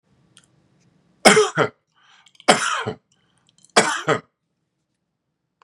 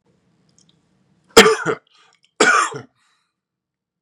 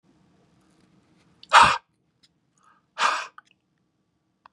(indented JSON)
{
  "three_cough_length": "5.6 s",
  "three_cough_amplitude": 32768,
  "three_cough_signal_mean_std_ratio": 0.3,
  "cough_length": "4.0 s",
  "cough_amplitude": 32768,
  "cough_signal_mean_std_ratio": 0.29,
  "exhalation_length": "4.5 s",
  "exhalation_amplitude": 28376,
  "exhalation_signal_mean_std_ratio": 0.23,
  "survey_phase": "beta (2021-08-13 to 2022-03-07)",
  "age": "45-64",
  "gender": "Male",
  "wearing_mask": "No",
  "symptom_none": true,
  "smoker_status": "Ex-smoker",
  "respiratory_condition_asthma": false,
  "respiratory_condition_other": false,
  "recruitment_source": "REACT",
  "submission_delay": "3 days",
  "covid_test_result": "Negative",
  "covid_test_method": "RT-qPCR",
  "influenza_a_test_result": "Negative",
  "influenza_b_test_result": "Negative"
}